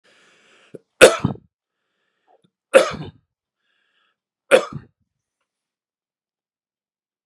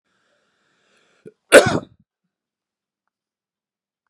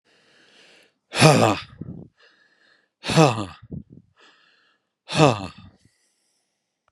three_cough_length: 7.3 s
three_cough_amplitude: 32768
three_cough_signal_mean_std_ratio: 0.18
cough_length: 4.1 s
cough_amplitude: 32768
cough_signal_mean_std_ratio: 0.16
exhalation_length: 6.9 s
exhalation_amplitude: 32767
exhalation_signal_mean_std_ratio: 0.3
survey_phase: beta (2021-08-13 to 2022-03-07)
age: 65+
gender: Male
wearing_mask: 'No'
symptom_none: true
smoker_status: Ex-smoker
respiratory_condition_asthma: false
respiratory_condition_other: false
recruitment_source: REACT
submission_delay: 2 days
covid_test_result: Negative
covid_test_method: RT-qPCR
influenza_a_test_result: Negative
influenza_b_test_result: Negative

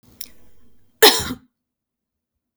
cough_length: 2.6 s
cough_amplitude: 32768
cough_signal_mean_std_ratio: 0.24
survey_phase: beta (2021-08-13 to 2022-03-07)
age: 18-44
gender: Female
wearing_mask: 'No'
symptom_cough_any: true
smoker_status: Never smoked
respiratory_condition_asthma: false
respiratory_condition_other: false
recruitment_source: REACT
submission_delay: 2 days
covid_test_result: Negative
covid_test_method: RT-qPCR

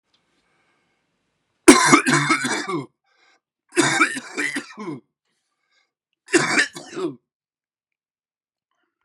three_cough_length: 9.0 s
three_cough_amplitude: 32768
three_cough_signal_mean_std_ratio: 0.34
survey_phase: beta (2021-08-13 to 2022-03-07)
age: 45-64
gender: Male
wearing_mask: 'No'
symptom_cough_any: true
symptom_new_continuous_cough: true
symptom_sore_throat: true
symptom_fatigue: true
smoker_status: Never smoked
respiratory_condition_asthma: false
respiratory_condition_other: false
recruitment_source: Test and Trace
submission_delay: 2 days
covid_test_result: Positive
covid_test_method: LFT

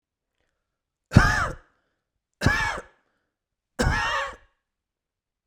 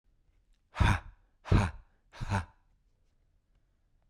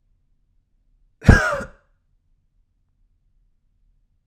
three_cough_length: 5.5 s
three_cough_amplitude: 32767
three_cough_signal_mean_std_ratio: 0.34
exhalation_length: 4.1 s
exhalation_amplitude: 8747
exhalation_signal_mean_std_ratio: 0.31
cough_length: 4.3 s
cough_amplitude: 32768
cough_signal_mean_std_ratio: 0.18
survey_phase: beta (2021-08-13 to 2022-03-07)
age: 18-44
gender: Male
wearing_mask: 'No'
symptom_none: true
smoker_status: Never smoked
respiratory_condition_asthma: false
respiratory_condition_other: false
recruitment_source: REACT
submission_delay: 2 days
covid_test_result: Negative
covid_test_method: RT-qPCR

